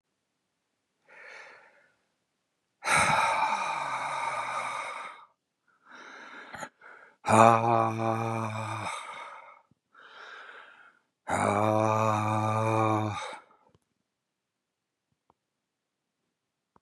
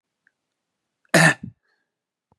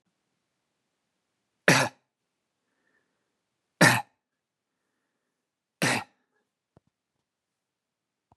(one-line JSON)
{"exhalation_length": "16.8 s", "exhalation_amplitude": 20832, "exhalation_signal_mean_std_ratio": 0.45, "cough_length": "2.4 s", "cough_amplitude": 26535, "cough_signal_mean_std_ratio": 0.24, "three_cough_length": "8.4 s", "three_cough_amplitude": 22942, "three_cough_signal_mean_std_ratio": 0.19, "survey_phase": "beta (2021-08-13 to 2022-03-07)", "age": "18-44", "gender": "Male", "wearing_mask": "No", "symptom_runny_or_blocked_nose": true, "symptom_onset": "10 days", "smoker_status": "Never smoked", "respiratory_condition_asthma": false, "respiratory_condition_other": false, "recruitment_source": "REACT", "submission_delay": "2 days", "covid_test_result": "Negative", "covid_test_method": "RT-qPCR", "influenza_a_test_result": "Negative", "influenza_b_test_result": "Negative"}